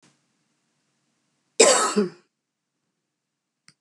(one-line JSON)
{"cough_length": "3.8 s", "cough_amplitude": 29499, "cough_signal_mean_std_ratio": 0.25, "survey_phase": "beta (2021-08-13 to 2022-03-07)", "age": "65+", "gender": "Female", "wearing_mask": "No", "symptom_cough_any": true, "symptom_runny_or_blocked_nose": true, "symptom_shortness_of_breath": true, "symptom_onset": "10 days", "smoker_status": "Never smoked", "respiratory_condition_asthma": false, "respiratory_condition_other": false, "recruitment_source": "REACT", "submission_delay": "3 days", "covid_test_result": "Positive", "covid_test_method": "RT-qPCR", "covid_ct_value": 25.0, "covid_ct_gene": "E gene", "influenza_a_test_result": "Negative", "influenza_b_test_result": "Negative"}